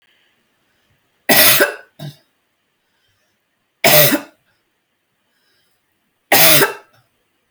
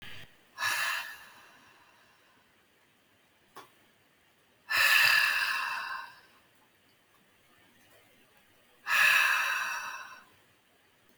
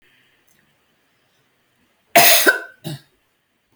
three_cough_length: 7.5 s
three_cough_amplitude: 32768
three_cough_signal_mean_std_ratio: 0.33
exhalation_length: 11.2 s
exhalation_amplitude: 10128
exhalation_signal_mean_std_ratio: 0.41
cough_length: 3.8 s
cough_amplitude: 32768
cough_signal_mean_std_ratio: 0.28
survey_phase: beta (2021-08-13 to 2022-03-07)
age: 45-64
gender: Female
wearing_mask: 'No'
symptom_none: true
smoker_status: Never smoked
respiratory_condition_asthma: false
respiratory_condition_other: false
recruitment_source: REACT
submission_delay: 2 days
covid_test_result: Negative
covid_test_method: RT-qPCR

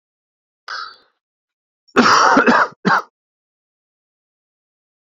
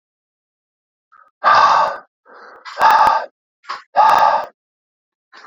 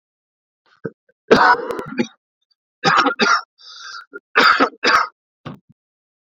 cough_length: 5.1 s
cough_amplitude: 32767
cough_signal_mean_std_ratio: 0.35
exhalation_length: 5.5 s
exhalation_amplitude: 31107
exhalation_signal_mean_std_ratio: 0.45
three_cough_length: 6.2 s
three_cough_amplitude: 32375
three_cough_signal_mean_std_ratio: 0.42
survey_phase: beta (2021-08-13 to 2022-03-07)
age: 18-44
gender: Male
wearing_mask: 'No'
symptom_cough_any: true
symptom_sore_throat: true
symptom_fever_high_temperature: true
symptom_onset: 4 days
smoker_status: Ex-smoker
respiratory_condition_asthma: false
respiratory_condition_other: false
recruitment_source: Test and Trace
submission_delay: 1 day
covid_test_result: Positive
covid_test_method: RT-qPCR
covid_ct_value: 19.5
covid_ct_gene: ORF1ab gene
covid_ct_mean: 19.9
covid_viral_load: 300000 copies/ml
covid_viral_load_category: Low viral load (10K-1M copies/ml)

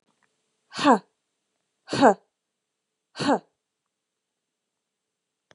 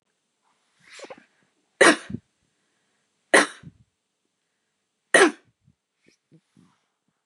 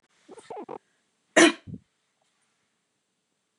exhalation_length: 5.5 s
exhalation_amplitude: 24994
exhalation_signal_mean_std_ratio: 0.23
three_cough_length: 7.3 s
three_cough_amplitude: 28941
three_cough_signal_mean_std_ratio: 0.2
cough_length: 3.6 s
cough_amplitude: 19070
cough_signal_mean_std_ratio: 0.19
survey_phase: beta (2021-08-13 to 2022-03-07)
age: 18-44
gender: Female
wearing_mask: 'No'
symptom_none: true
symptom_onset: 13 days
smoker_status: Never smoked
respiratory_condition_asthma: false
respiratory_condition_other: false
recruitment_source: REACT
submission_delay: 1 day
covid_test_result: Negative
covid_test_method: RT-qPCR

